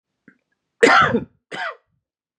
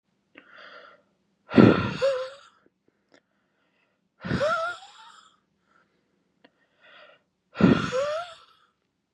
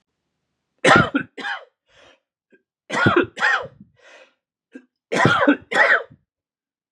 {"cough_length": "2.4 s", "cough_amplitude": 32767, "cough_signal_mean_std_ratio": 0.35, "exhalation_length": "9.1 s", "exhalation_amplitude": 31943, "exhalation_signal_mean_std_ratio": 0.31, "three_cough_length": "6.9 s", "three_cough_amplitude": 32531, "three_cough_signal_mean_std_ratio": 0.4, "survey_phase": "beta (2021-08-13 to 2022-03-07)", "age": "18-44", "gender": "Male", "wearing_mask": "No", "symptom_sore_throat": true, "smoker_status": "Never smoked", "respiratory_condition_asthma": false, "respiratory_condition_other": false, "recruitment_source": "Test and Trace", "submission_delay": "0 days", "covid_test_result": "Negative", "covid_test_method": "LFT"}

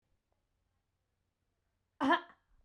{"cough_length": "2.6 s", "cough_amplitude": 4557, "cough_signal_mean_std_ratio": 0.22, "survey_phase": "beta (2021-08-13 to 2022-03-07)", "age": "18-44", "gender": "Female", "wearing_mask": "No", "symptom_none": true, "smoker_status": "Never smoked", "respiratory_condition_asthma": false, "respiratory_condition_other": false, "recruitment_source": "REACT", "submission_delay": "3 days", "covid_test_result": "Negative", "covid_test_method": "RT-qPCR", "influenza_a_test_result": "Unknown/Void", "influenza_b_test_result": "Unknown/Void"}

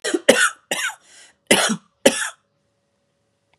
{"cough_length": "3.6 s", "cough_amplitude": 32768, "cough_signal_mean_std_ratio": 0.37, "survey_phase": "beta (2021-08-13 to 2022-03-07)", "age": "45-64", "gender": "Female", "wearing_mask": "No", "symptom_cough_any": true, "symptom_runny_or_blocked_nose": true, "symptom_onset": "7 days", "smoker_status": "Never smoked", "respiratory_condition_asthma": false, "respiratory_condition_other": false, "recruitment_source": "REACT", "submission_delay": "2 days", "covid_test_result": "Negative", "covid_test_method": "RT-qPCR", "influenza_a_test_result": "Negative", "influenza_b_test_result": "Negative"}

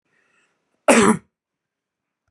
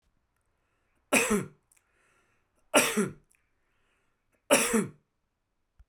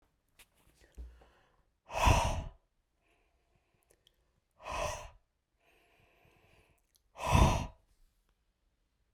{"cough_length": "2.3 s", "cough_amplitude": 32767, "cough_signal_mean_std_ratio": 0.28, "three_cough_length": "5.9 s", "three_cough_amplitude": 15171, "three_cough_signal_mean_std_ratio": 0.32, "exhalation_length": "9.1 s", "exhalation_amplitude": 8563, "exhalation_signal_mean_std_ratio": 0.28, "survey_phase": "beta (2021-08-13 to 2022-03-07)", "age": "45-64", "gender": "Male", "wearing_mask": "No", "symptom_none": true, "smoker_status": "Never smoked", "respiratory_condition_asthma": false, "respiratory_condition_other": false, "recruitment_source": "REACT", "submission_delay": "3 days", "covid_test_result": "Negative", "covid_test_method": "RT-qPCR"}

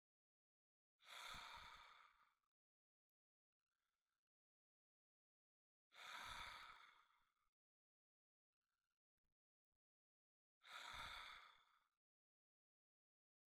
{"exhalation_length": "13.5 s", "exhalation_amplitude": 279, "exhalation_signal_mean_std_ratio": 0.35, "survey_phase": "beta (2021-08-13 to 2022-03-07)", "age": "45-64", "gender": "Male", "wearing_mask": "No", "symptom_none": true, "smoker_status": "Ex-smoker", "respiratory_condition_asthma": false, "respiratory_condition_other": false, "recruitment_source": "REACT", "submission_delay": "2 days", "covid_test_result": "Negative", "covid_test_method": "RT-qPCR", "influenza_a_test_result": "Negative", "influenza_b_test_result": "Negative"}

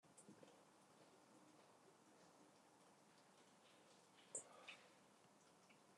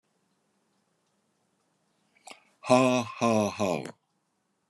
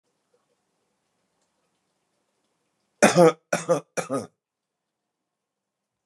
{"cough_length": "6.0 s", "cough_amplitude": 512, "cough_signal_mean_std_ratio": 0.67, "exhalation_length": "4.7 s", "exhalation_amplitude": 13276, "exhalation_signal_mean_std_ratio": 0.34, "three_cough_length": "6.1 s", "three_cough_amplitude": 25548, "three_cough_signal_mean_std_ratio": 0.22, "survey_phase": "beta (2021-08-13 to 2022-03-07)", "age": "45-64", "gender": "Male", "wearing_mask": "No", "symptom_cough_any": true, "symptom_fatigue": true, "smoker_status": "Current smoker (11 or more cigarettes per day)", "respiratory_condition_asthma": false, "respiratory_condition_other": false, "recruitment_source": "REACT", "submission_delay": "2 days", "covid_test_result": "Negative", "covid_test_method": "RT-qPCR"}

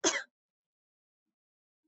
{"cough_length": "1.9 s", "cough_amplitude": 9141, "cough_signal_mean_std_ratio": 0.22, "survey_phase": "beta (2021-08-13 to 2022-03-07)", "age": "18-44", "gender": "Female", "wearing_mask": "No", "symptom_none": true, "smoker_status": "Never smoked", "respiratory_condition_asthma": false, "respiratory_condition_other": false, "recruitment_source": "REACT", "submission_delay": "1 day", "covid_test_result": "Negative", "covid_test_method": "RT-qPCR", "influenza_a_test_result": "Negative", "influenza_b_test_result": "Negative"}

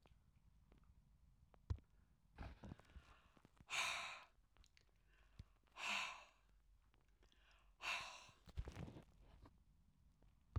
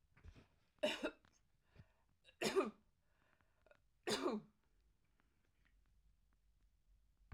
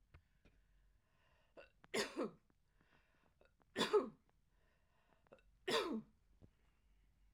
{"exhalation_length": "10.6 s", "exhalation_amplitude": 840, "exhalation_signal_mean_std_ratio": 0.41, "cough_length": "7.3 s", "cough_amplitude": 1834, "cough_signal_mean_std_ratio": 0.3, "three_cough_length": "7.3 s", "three_cough_amplitude": 2190, "three_cough_signal_mean_std_ratio": 0.29, "survey_phase": "alpha (2021-03-01 to 2021-08-12)", "age": "65+", "gender": "Female", "wearing_mask": "No", "symptom_none": true, "smoker_status": "Never smoked", "respiratory_condition_asthma": false, "respiratory_condition_other": false, "recruitment_source": "REACT", "submission_delay": "2 days", "covid_test_result": "Negative", "covid_test_method": "RT-qPCR"}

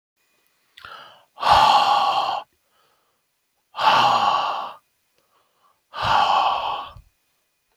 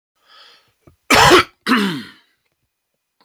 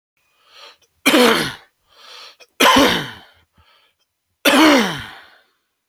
{"exhalation_length": "7.8 s", "exhalation_amplitude": 22880, "exhalation_signal_mean_std_ratio": 0.5, "cough_length": "3.2 s", "cough_amplitude": 31638, "cough_signal_mean_std_ratio": 0.36, "three_cough_length": "5.9 s", "three_cough_amplitude": 32768, "three_cough_signal_mean_std_ratio": 0.4, "survey_phase": "beta (2021-08-13 to 2022-03-07)", "age": "45-64", "gender": "Male", "wearing_mask": "No", "symptom_cough_any": true, "symptom_runny_or_blocked_nose": true, "symptom_other": true, "symptom_onset": "3 days", "smoker_status": "Never smoked", "respiratory_condition_asthma": false, "respiratory_condition_other": false, "recruitment_source": "Test and Trace", "submission_delay": "1 day", "covid_test_result": "Positive", "covid_test_method": "RT-qPCR", "covid_ct_value": 15.7, "covid_ct_gene": "ORF1ab gene", "covid_ct_mean": 16.1, "covid_viral_load": "5100000 copies/ml", "covid_viral_load_category": "High viral load (>1M copies/ml)"}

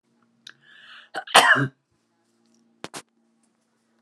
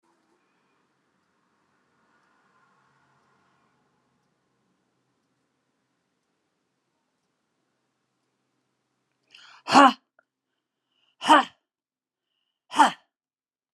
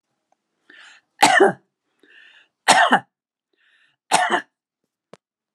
{"cough_length": "4.0 s", "cough_amplitude": 32767, "cough_signal_mean_std_ratio": 0.24, "exhalation_length": "13.7 s", "exhalation_amplitude": 27713, "exhalation_signal_mean_std_ratio": 0.15, "three_cough_length": "5.5 s", "three_cough_amplitude": 32703, "three_cough_signal_mean_std_ratio": 0.31, "survey_phase": "alpha (2021-03-01 to 2021-08-12)", "age": "65+", "gender": "Female", "wearing_mask": "No", "symptom_none": true, "smoker_status": "Ex-smoker", "respiratory_condition_asthma": false, "respiratory_condition_other": false, "recruitment_source": "REACT", "submission_delay": "1 day", "covid_test_result": "Negative", "covid_test_method": "RT-qPCR"}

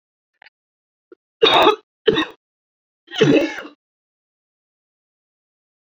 {"three_cough_length": "5.8 s", "three_cough_amplitude": 27611, "three_cough_signal_mean_std_ratio": 0.31, "survey_phase": "beta (2021-08-13 to 2022-03-07)", "age": "18-44", "gender": "Female", "wearing_mask": "No", "symptom_shortness_of_breath": true, "symptom_abdominal_pain": true, "symptom_headache": true, "symptom_onset": "12 days", "smoker_status": "Ex-smoker", "respiratory_condition_asthma": true, "respiratory_condition_other": false, "recruitment_source": "REACT", "submission_delay": "6 days", "covid_test_result": "Negative", "covid_test_method": "RT-qPCR"}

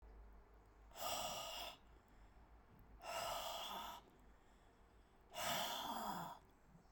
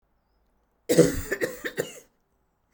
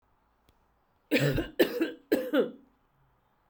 {"exhalation_length": "6.9 s", "exhalation_amplitude": 1022, "exhalation_signal_mean_std_ratio": 0.67, "cough_length": "2.7 s", "cough_amplitude": 23174, "cough_signal_mean_std_ratio": 0.33, "three_cough_length": "3.5 s", "three_cough_amplitude": 9770, "three_cough_signal_mean_std_ratio": 0.42, "survey_phase": "beta (2021-08-13 to 2022-03-07)", "age": "45-64", "gender": "Female", "wearing_mask": "No", "symptom_cough_any": true, "symptom_runny_or_blocked_nose": true, "symptom_onset": "3 days", "smoker_status": "Never smoked", "respiratory_condition_asthma": true, "respiratory_condition_other": false, "recruitment_source": "Test and Trace", "submission_delay": "1 day", "covid_test_result": "Positive", "covid_test_method": "RT-qPCR", "covid_ct_value": 18.8, "covid_ct_gene": "ORF1ab gene"}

